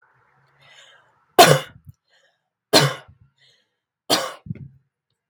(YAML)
three_cough_length: 5.3 s
three_cough_amplitude: 32768
three_cough_signal_mean_std_ratio: 0.25
survey_phase: beta (2021-08-13 to 2022-03-07)
age: 18-44
gender: Female
wearing_mask: 'No'
symptom_none: true
smoker_status: Never smoked
respiratory_condition_asthma: false
respiratory_condition_other: false
recruitment_source: Test and Trace
submission_delay: 1 day
covid_test_result: Positive
covid_test_method: RT-qPCR
covid_ct_value: 26.3
covid_ct_gene: ORF1ab gene